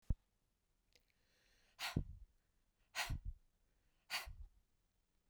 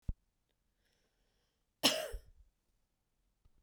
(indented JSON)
{
  "exhalation_length": "5.3 s",
  "exhalation_amplitude": 2154,
  "exhalation_signal_mean_std_ratio": 0.31,
  "cough_length": "3.6 s",
  "cough_amplitude": 8909,
  "cough_signal_mean_std_ratio": 0.22,
  "survey_phase": "beta (2021-08-13 to 2022-03-07)",
  "age": "45-64",
  "gender": "Female",
  "wearing_mask": "No",
  "symptom_runny_or_blocked_nose": true,
  "smoker_status": "Ex-smoker",
  "respiratory_condition_asthma": false,
  "respiratory_condition_other": false,
  "recruitment_source": "REACT",
  "submission_delay": "2 days",
  "covid_test_result": "Negative",
  "covid_test_method": "RT-qPCR",
  "influenza_a_test_result": "Negative",
  "influenza_b_test_result": "Negative"
}